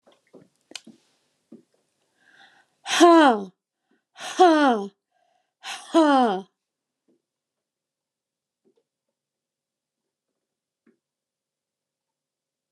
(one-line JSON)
{"exhalation_length": "12.7 s", "exhalation_amplitude": 26380, "exhalation_signal_mean_std_ratio": 0.25, "survey_phase": "alpha (2021-03-01 to 2021-08-12)", "age": "45-64", "gender": "Female", "wearing_mask": "No", "symptom_cough_any": true, "symptom_headache": true, "smoker_status": "Never smoked", "respiratory_condition_asthma": false, "respiratory_condition_other": false, "recruitment_source": "REACT", "submission_delay": "7 days", "covid_test_result": "Negative", "covid_test_method": "RT-qPCR"}